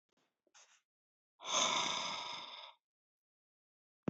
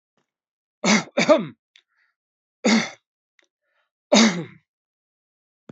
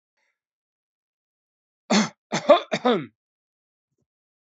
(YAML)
exhalation_length: 4.1 s
exhalation_amplitude: 3665
exhalation_signal_mean_std_ratio: 0.4
three_cough_length: 5.7 s
three_cough_amplitude: 26304
three_cough_signal_mean_std_ratio: 0.32
cough_length: 4.4 s
cough_amplitude: 24044
cough_signal_mean_std_ratio: 0.27
survey_phase: beta (2021-08-13 to 2022-03-07)
age: 65+
gender: Male
wearing_mask: 'No'
symptom_none: true
smoker_status: Never smoked
respiratory_condition_asthma: false
respiratory_condition_other: false
recruitment_source: REACT
submission_delay: 2 days
covid_test_result: Negative
covid_test_method: RT-qPCR
influenza_a_test_result: Negative
influenza_b_test_result: Negative